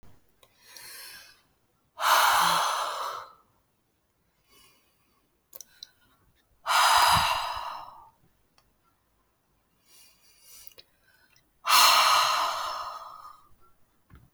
{
  "exhalation_length": "14.3 s",
  "exhalation_amplitude": 15757,
  "exhalation_signal_mean_std_ratio": 0.4,
  "survey_phase": "beta (2021-08-13 to 2022-03-07)",
  "age": "18-44",
  "gender": "Female",
  "wearing_mask": "No",
  "symptom_cough_any": true,
  "symptom_runny_or_blocked_nose": true,
  "symptom_sore_throat": true,
  "symptom_fatigue": true,
  "symptom_fever_high_temperature": true,
  "symptom_headache": true,
  "symptom_change_to_sense_of_smell_or_taste": true,
  "smoker_status": "Never smoked",
  "respiratory_condition_asthma": false,
  "respiratory_condition_other": false,
  "recruitment_source": "Test and Trace",
  "submission_delay": "1 day",
  "covid_test_result": "Positive",
  "covid_test_method": "RT-qPCR",
  "covid_ct_value": 21.7,
  "covid_ct_gene": "ORF1ab gene"
}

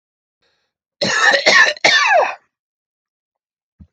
{
  "cough_length": "3.9 s",
  "cough_amplitude": 29815,
  "cough_signal_mean_std_ratio": 0.46,
  "survey_phase": "alpha (2021-03-01 to 2021-08-12)",
  "age": "45-64",
  "gender": "Male",
  "wearing_mask": "No",
  "symptom_none": true,
  "smoker_status": "Ex-smoker",
  "respiratory_condition_asthma": false,
  "respiratory_condition_other": false,
  "recruitment_source": "REACT",
  "submission_delay": "2 days",
  "covid_test_result": "Negative",
  "covid_test_method": "RT-qPCR"
}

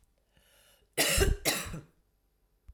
{
  "cough_length": "2.7 s",
  "cough_amplitude": 8052,
  "cough_signal_mean_std_ratio": 0.4,
  "survey_phase": "alpha (2021-03-01 to 2021-08-12)",
  "age": "45-64",
  "gender": "Female",
  "wearing_mask": "No",
  "symptom_diarrhoea": true,
  "symptom_fatigue": true,
  "symptom_headache": true,
  "smoker_status": "Never smoked",
  "respiratory_condition_asthma": false,
  "respiratory_condition_other": false,
  "recruitment_source": "Test and Trace",
  "submission_delay": "2 days",
  "covid_test_result": "Positive",
  "covid_test_method": "RT-qPCR"
}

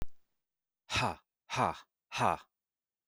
{
  "exhalation_length": "3.1 s",
  "exhalation_amplitude": 6213,
  "exhalation_signal_mean_std_ratio": 0.39,
  "survey_phase": "beta (2021-08-13 to 2022-03-07)",
  "age": "18-44",
  "gender": "Male",
  "wearing_mask": "No",
  "symptom_none": true,
  "smoker_status": "Current smoker (e-cigarettes or vapes only)",
  "respiratory_condition_asthma": false,
  "respiratory_condition_other": false,
  "recruitment_source": "REACT",
  "submission_delay": "2 days",
  "covid_test_result": "Negative",
  "covid_test_method": "RT-qPCR"
}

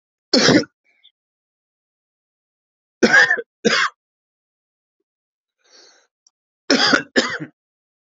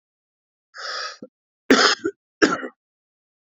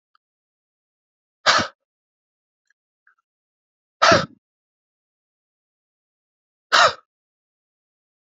{
  "three_cough_length": "8.1 s",
  "three_cough_amplitude": 31437,
  "three_cough_signal_mean_std_ratio": 0.32,
  "cough_length": "3.4 s",
  "cough_amplitude": 28198,
  "cough_signal_mean_std_ratio": 0.32,
  "exhalation_length": "8.4 s",
  "exhalation_amplitude": 30680,
  "exhalation_signal_mean_std_ratio": 0.2,
  "survey_phase": "beta (2021-08-13 to 2022-03-07)",
  "age": "45-64",
  "gender": "Male",
  "wearing_mask": "No",
  "symptom_cough_any": true,
  "symptom_runny_or_blocked_nose": true,
  "symptom_diarrhoea": true,
  "symptom_fatigue": true,
  "symptom_fever_high_temperature": true,
  "symptom_headache": true,
  "symptom_change_to_sense_of_smell_or_taste": true,
  "symptom_onset": "4 days",
  "smoker_status": "Never smoked",
  "respiratory_condition_asthma": true,
  "respiratory_condition_other": false,
  "recruitment_source": "Test and Trace",
  "submission_delay": "2 days",
  "covid_test_result": "Positive",
  "covid_test_method": "RT-qPCR",
  "covid_ct_value": 18.4,
  "covid_ct_gene": "ORF1ab gene",
  "covid_ct_mean": 19.1,
  "covid_viral_load": "530000 copies/ml",
  "covid_viral_load_category": "Low viral load (10K-1M copies/ml)"
}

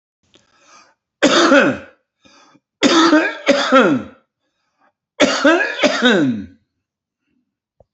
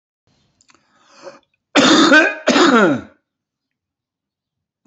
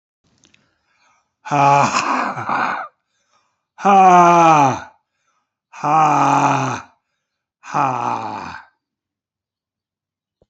{
  "three_cough_length": "7.9 s",
  "three_cough_amplitude": 30570,
  "three_cough_signal_mean_std_ratio": 0.49,
  "cough_length": "4.9 s",
  "cough_amplitude": 32768,
  "cough_signal_mean_std_ratio": 0.41,
  "exhalation_length": "10.5 s",
  "exhalation_amplitude": 31183,
  "exhalation_signal_mean_std_ratio": 0.47,
  "survey_phase": "beta (2021-08-13 to 2022-03-07)",
  "age": "45-64",
  "gender": "Male",
  "wearing_mask": "No",
  "symptom_none": true,
  "smoker_status": "Current smoker (11 or more cigarettes per day)",
  "respiratory_condition_asthma": false,
  "respiratory_condition_other": true,
  "recruitment_source": "REACT",
  "submission_delay": "0 days",
  "covid_test_result": "Negative",
  "covid_test_method": "RT-qPCR",
  "influenza_a_test_result": "Negative",
  "influenza_b_test_result": "Negative"
}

